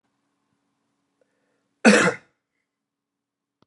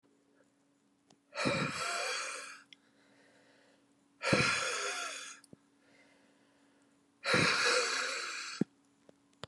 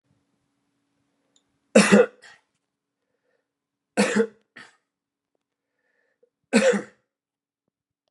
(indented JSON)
{
  "cough_length": "3.7 s",
  "cough_amplitude": 29780,
  "cough_signal_mean_std_ratio": 0.21,
  "exhalation_length": "9.5 s",
  "exhalation_amplitude": 5381,
  "exhalation_signal_mean_std_ratio": 0.49,
  "three_cough_length": "8.1 s",
  "three_cough_amplitude": 27103,
  "three_cough_signal_mean_std_ratio": 0.24,
  "survey_phase": "beta (2021-08-13 to 2022-03-07)",
  "age": "45-64",
  "gender": "Male",
  "wearing_mask": "No",
  "symptom_none": true,
  "smoker_status": "Current smoker (1 to 10 cigarettes per day)",
  "respiratory_condition_asthma": false,
  "respiratory_condition_other": false,
  "recruitment_source": "REACT",
  "submission_delay": "0 days",
  "covid_test_result": "Negative",
  "covid_test_method": "RT-qPCR",
  "influenza_a_test_result": "Negative",
  "influenza_b_test_result": "Negative"
}